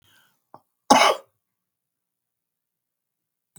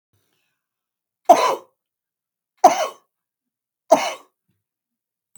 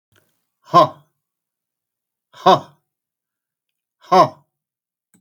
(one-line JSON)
{"cough_length": "3.6 s", "cough_amplitude": 32767, "cough_signal_mean_std_ratio": 0.2, "three_cough_length": "5.4 s", "three_cough_amplitude": 32768, "three_cough_signal_mean_std_ratio": 0.23, "exhalation_length": "5.2 s", "exhalation_amplitude": 32768, "exhalation_signal_mean_std_ratio": 0.22, "survey_phase": "beta (2021-08-13 to 2022-03-07)", "age": "45-64", "gender": "Male", "wearing_mask": "No", "symptom_runny_or_blocked_nose": true, "symptom_headache": true, "symptom_onset": "4 days", "smoker_status": "Never smoked", "respiratory_condition_asthma": true, "respiratory_condition_other": true, "recruitment_source": "Test and Trace", "submission_delay": "1 day", "covid_test_result": "Positive", "covid_test_method": "ePCR"}